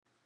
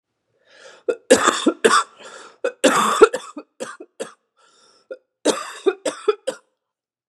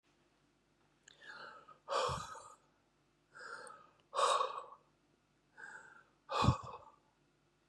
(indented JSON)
{
  "three_cough_length": "0.3 s",
  "three_cough_amplitude": 27,
  "three_cough_signal_mean_std_ratio": 0.95,
  "cough_length": "7.1 s",
  "cough_amplitude": 32768,
  "cough_signal_mean_std_ratio": 0.36,
  "exhalation_length": "7.7 s",
  "exhalation_amplitude": 5088,
  "exhalation_signal_mean_std_ratio": 0.35,
  "survey_phase": "beta (2021-08-13 to 2022-03-07)",
  "age": "45-64",
  "gender": "Female",
  "wearing_mask": "No",
  "symptom_cough_any": true,
  "symptom_shortness_of_breath": true,
  "symptom_fever_high_temperature": true,
  "symptom_headache": true,
  "symptom_loss_of_taste": true,
  "symptom_onset": "6 days",
  "smoker_status": "Ex-smoker",
  "respiratory_condition_asthma": true,
  "respiratory_condition_other": false,
  "recruitment_source": "Test and Trace",
  "submission_delay": "1 day",
  "covid_test_result": "Positive",
  "covid_test_method": "RT-qPCR",
  "covid_ct_value": 15.7,
  "covid_ct_gene": "ORF1ab gene",
  "covid_ct_mean": 16.1,
  "covid_viral_load": "5200000 copies/ml",
  "covid_viral_load_category": "High viral load (>1M copies/ml)"
}